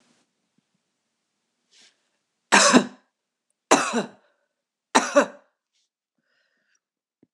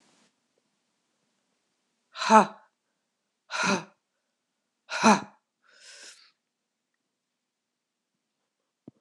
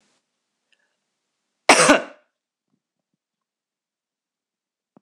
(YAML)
three_cough_length: 7.3 s
three_cough_amplitude: 26028
three_cough_signal_mean_std_ratio: 0.25
exhalation_length: 9.0 s
exhalation_amplitude: 23916
exhalation_signal_mean_std_ratio: 0.2
cough_length: 5.0 s
cough_amplitude: 26028
cough_signal_mean_std_ratio: 0.18
survey_phase: beta (2021-08-13 to 2022-03-07)
age: 45-64
gender: Female
wearing_mask: 'No'
symptom_cough_any: true
symptom_runny_or_blocked_nose: true
symptom_shortness_of_breath: true
symptom_sore_throat: true
symptom_abdominal_pain: true
symptom_diarrhoea: true
symptom_fatigue: true
symptom_fever_high_temperature: true
symptom_change_to_sense_of_smell_or_taste: true
symptom_other: true
symptom_onset: 4 days
smoker_status: Never smoked
respiratory_condition_asthma: false
respiratory_condition_other: false
recruitment_source: Test and Trace
submission_delay: 2 days
covid_test_result: Positive
covid_test_method: RT-qPCR
covid_ct_value: 24.6
covid_ct_gene: N gene